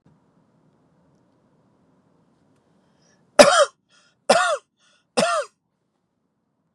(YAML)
three_cough_length: 6.7 s
three_cough_amplitude: 32768
three_cough_signal_mean_std_ratio: 0.24
survey_phase: beta (2021-08-13 to 2022-03-07)
age: 18-44
gender: Male
wearing_mask: 'No'
symptom_none: true
symptom_onset: 7 days
smoker_status: Ex-smoker
respiratory_condition_asthma: false
respiratory_condition_other: false
recruitment_source: REACT
submission_delay: 2 days
covid_test_result: Negative
covid_test_method: RT-qPCR
influenza_a_test_result: Negative
influenza_b_test_result: Negative